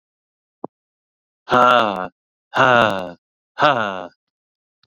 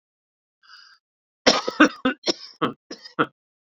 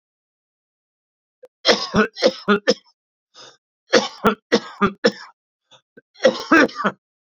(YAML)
exhalation_length: 4.9 s
exhalation_amplitude: 28863
exhalation_signal_mean_std_ratio: 0.38
cough_length: 3.8 s
cough_amplitude: 28399
cough_signal_mean_std_ratio: 0.29
three_cough_length: 7.3 s
three_cough_amplitude: 30637
three_cough_signal_mean_std_ratio: 0.35
survey_phase: beta (2021-08-13 to 2022-03-07)
age: 45-64
gender: Male
wearing_mask: 'No'
symptom_cough_any: true
symptom_runny_or_blocked_nose: true
symptom_shortness_of_breath: true
symptom_fatigue: true
smoker_status: Ex-smoker
respiratory_condition_asthma: false
respiratory_condition_other: false
recruitment_source: Test and Trace
submission_delay: 1 day
covid_test_result: Positive
covid_test_method: RT-qPCR
covid_ct_value: 17.0
covid_ct_gene: ORF1ab gene
covid_ct_mean: 18.0
covid_viral_load: 1300000 copies/ml
covid_viral_load_category: High viral load (>1M copies/ml)